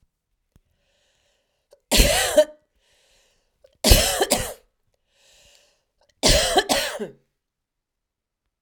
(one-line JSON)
{"three_cough_length": "8.6 s", "three_cough_amplitude": 32767, "three_cough_signal_mean_std_ratio": 0.34, "survey_phase": "alpha (2021-03-01 to 2021-08-12)", "age": "45-64", "gender": "Female", "wearing_mask": "No", "symptom_none": true, "smoker_status": "Ex-smoker", "respiratory_condition_asthma": true, "respiratory_condition_other": false, "recruitment_source": "REACT", "submission_delay": "2 days", "covid_test_result": "Negative", "covid_test_method": "RT-qPCR"}